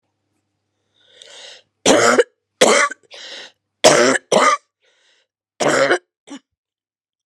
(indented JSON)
{
  "three_cough_length": "7.3 s",
  "three_cough_amplitude": 32768,
  "three_cough_signal_mean_std_ratio": 0.39,
  "survey_phase": "beta (2021-08-13 to 2022-03-07)",
  "age": "65+",
  "gender": "Female",
  "wearing_mask": "No",
  "symptom_cough_any": true,
  "symptom_new_continuous_cough": true,
  "symptom_runny_or_blocked_nose": true,
  "symptom_shortness_of_breath": true,
  "symptom_sore_throat": true,
  "symptom_fatigue": true,
  "symptom_fever_high_temperature": true,
  "symptom_headache": true,
  "symptom_change_to_sense_of_smell_or_taste": true,
  "symptom_loss_of_taste": true,
  "symptom_other": true,
  "smoker_status": "Never smoked",
  "respiratory_condition_asthma": false,
  "respiratory_condition_other": false,
  "recruitment_source": "Test and Trace",
  "submission_delay": "2 days",
  "covid_test_result": "Positive",
  "covid_test_method": "RT-qPCR",
  "covid_ct_value": 22.4,
  "covid_ct_gene": "ORF1ab gene",
  "covid_ct_mean": 22.9,
  "covid_viral_load": "32000 copies/ml",
  "covid_viral_load_category": "Low viral load (10K-1M copies/ml)"
}